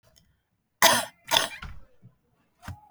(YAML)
cough_length: 2.9 s
cough_amplitude: 26795
cough_signal_mean_std_ratio: 0.3
survey_phase: beta (2021-08-13 to 2022-03-07)
age: 18-44
gender: Female
wearing_mask: 'No'
symptom_cough_any: true
symptom_fatigue: true
smoker_status: Never smoked
respiratory_condition_asthma: false
respiratory_condition_other: false
recruitment_source: REACT
submission_delay: 3 days
covid_test_result: Negative
covid_test_method: RT-qPCR
influenza_a_test_result: Negative
influenza_b_test_result: Negative